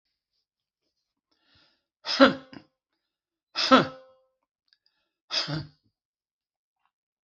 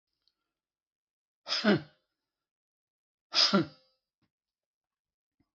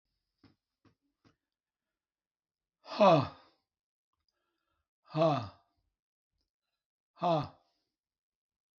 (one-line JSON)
{"three_cough_length": "7.3 s", "three_cough_amplitude": 25692, "three_cough_signal_mean_std_ratio": 0.22, "cough_length": "5.5 s", "cough_amplitude": 9735, "cough_signal_mean_std_ratio": 0.25, "exhalation_length": "8.8 s", "exhalation_amplitude": 8488, "exhalation_signal_mean_std_ratio": 0.23, "survey_phase": "beta (2021-08-13 to 2022-03-07)", "age": "65+", "gender": "Male", "wearing_mask": "No", "symptom_none": true, "smoker_status": "Ex-smoker", "respiratory_condition_asthma": false, "respiratory_condition_other": false, "recruitment_source": "REACT", "submission_delay": "3 days", "covid_test_result": "Negative", "covid_test_method": "RT-qPCR", "influenza_a_test_result": "Negative", "influenza_b_test_result": "Negative"}